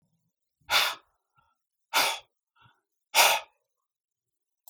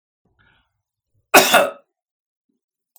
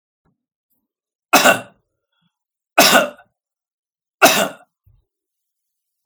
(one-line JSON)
{"exhalation_length": "4.7 s", "exhalation_amplitude": 17905, "exhalation_signal_mean_std_ratio": 0.3, "cough_length": "3.0 s", "cough_amplitude": 32768, "cough_signal_mean_std_ratio": 0.25, "three_cough_length": "6.1 s", "three_cough_amplitude": 32768, "three_cough_signal_mean_std_ratio": 0.28, "survey_phase": "beta (2021-08-13 to 2022-03-07)", "age": "45-64", "gender": "Male", "wearing_mask": "No", "symptom_none": true, "smoker_status": "Never smoked", "respiratory_condition_asthma": false, "respiratory_condition_other": false, "recruitment_source": "REACT", "submission_delay": "0 days", "covid_test_result": "Negative", "covid_test_method": "RT-qPCR", "influenza_a_test_result": "Negative", "influenza_b_test_result": "Negative"}